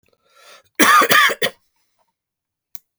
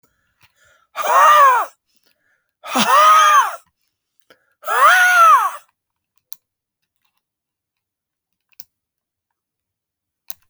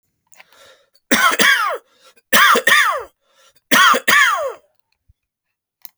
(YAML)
cough_length: 3.0 s
cough_amplitude: 32768
cough_signal_mean_std_ratio: 0.37
exhalation_length: 10.5 s
exhalation_amplitude: 30419
exhalation_signal_mean_std_ratio: 0.4
three_cough_length: 6.0 s
three_cough_amplitude: 32768
three_cough_signal_mean_std_ratio: 0.48
survey_phase: beta (2021-08-13 to 2022-03-07)
age: 45-64
gender: Male
wearing_mask: 'No'
symptom_cough_any: true
symptom_sore_throat: true
symptom_fatigue: true
symptom_onset: 5 days
smoker_status: Never smoked
respiratory_condition_asthma: false
respiratory_condition_other: false
recruitment_source: Test and Trace
submission_delay: 2 days
covid_test_result: Positive
covid_test_method: RT-qPCR
covid_ct_value: 15.2
covid_ct_gene: N gene
covid_ct_mean: 16.2
covid_viral_load: 5000000 copies/ml
covid_viral_load_category: High viral load (>1M copies/ml)